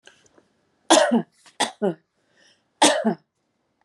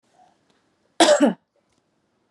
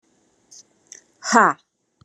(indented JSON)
{
  "three_cough_length": "3.8 s",
  "three_cough_amplitude": 31105,
  "three_cough_signal_mean_std_ratio": 0.35,
  "cough_length": "2.3 s",
  "cough_amplitude": 27999,
  "cough_signal_mean_std_ratio": 0.3,
  "exhalation_length": "2.0 s",
  "exhalation_amplitude": 30393,
  "exhalation_signal_mean_std_ratio": 0.26,
  "survey_phase": "beta (2021-08-13 to 2022-03-07)",
  "age": "45-64",
  "gender": "Female",
  "wearing_mask": "No",
  "symptom_sore_throat": true,
  "smoker_status": "Ex-smoker",
  "respiratory_condition_asthma": false,
  "respiratory_condition_other": false,
  "recruitment_source": "REACT",
  "submission_delay": "1 day",
  "covid_test_result": "Negative",
  "covid_test_method": "RT-qPCR"
}